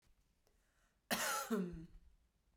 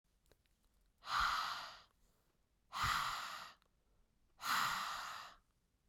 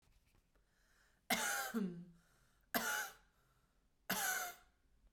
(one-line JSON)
{"cough_length": "2.6 s", "cough_amplitude": 2286, "cough_signal_mean_std_ratio": 0.45, "exhalation_length": "5.9 s", "exhalation_amplitude": 1974, "exhalation_signal_mean_std_ratio": 0.5, "three_cough_length": "5.1 s", "three_cough_amplitude": 3472, "three_cough_signal_mean_std_ratio": 0.46, "survey_phase": "beta (2021-08-13 to 2022-03-07)", "age": "18-44", "gender": "Female", "wearing_mask": "No", "symptom_cough_any": true, "symptom_sore_throat": true, "symptom_onset": "9 days", "smoker_status": "Ex-smoker", "respiratory_condition_asthma": false, "respiratory_condition_other": false, "recruitment_source": "Test and Trace", "submission_delay": "0 days", "covid_test_result": "Positive", "covid_test_method": "RT-qPCR", "covid_ct_value": 30.6, "covid_ct_gene": "N gene", "covid_ct_mean": 31.3, "covid_viral_load": "52 copies/ml", "covid_viral_load_category": "Minimal viral load (< 10K copies/ml)"}